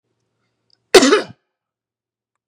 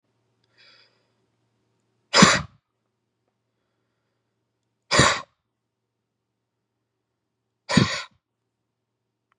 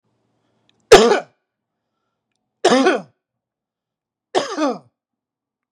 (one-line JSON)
{"cough_length": "2.5 s", "cough_amplitude": 32768, "cough_signal_mean_std_ratio": 0.25, "exhalation_length": "9.4 s", "exhalation_amplitude": 32756, "exhalation_signal_mean_std_ratio": 0.21, "three_cough_length": "5.7 s", "three_cough_amplitude": 32768, "three_cough_signal_mean_std_ratio": 0.28, "survey_phase": "beta (2021-08-13 to 2022-03-07)", "age": "45-64", "gender": "Male", "wearing_mask": "No", "symptom_none": true, "smoker_status": "Current smoker (e-cigarettes or vapes only)", "respiratory_condition_asthma": false, "respiratory_condition_other": false, "recruitment_source": "REACT", "submission_delay": "2 days", "covid_test_result": "Negative", "covid_test_method": "RT-qPCR", "influenza_a_test_result": "Negative", "influenza_b_test_result": "Negative"}